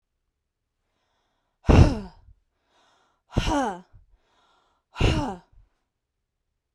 {"exhalation_length": "6.7 s", "exhalation_amplitude": 29592, "exhalation_signal_mean_std_ratio": 0.27, "survey_phase": "beta (2021-08-13 to 2022-03-07)", "age": "18-44", "gender": "Female", "wearing_mask": "No", "symptom_runny_or_blocked_nose": true, "symptom_onset": "3 days", "smoker_status": "Never smoked", "respiratory_condition_asthma": false, "respiratory_condition_other": false, "recruitment_source": "REACT", "submission_delay": "1 day", "covid_test_result": "Negative", "covid_test_method": "RT-qPCR", "influenza_a_test_result": "Negative", "influenza_b_test_result": "Negative"}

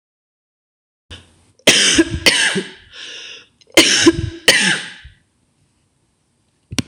{"cough_length": "6.9 s", "cough_amplitude": 26028, "cough_signal_mean_std_ratio": 0.41, "survey_phase": "beta (2021-08-13 to 2022-03-07)", "age": "65+", "gender": "Female", "wearing_mask": "No", "symptom_runny_or_blocked_nose": true, "smoker_status": "Ex-smoker", "respiratory_condition_asthma": false, "respiratory_condition_other": false, "recruitment_source": "REACT", "submission_delay": "1 day", "covid_test_result": "Negative", "covid_test_method": "RT-qPCR", "influenza_a_test_result": "Negative", "influenza_b_test_result": "Negative"}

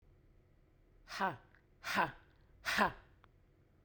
{"exhalation_length": "3.8 s", "exhalation_amplitude": 4617, "exhalation_signal_mean_std_ratio": 0.35, "survey_phase": "beta (2021-08-13 to 2022-03-07)", "age": "18-44", "gender": "Female", "wearing_mask": "No", "symptom_none": true, "smoker_status": "Current smoker (1 to 10 cigarettes per day)", "respiratory_condition_asthma": false, "respiratory_condition_other": false, "recruitment_source": "REACT", "submission_delay": "1 day", "covid_test_result": "Negative", "covid_test_method": "RT-qPCR"}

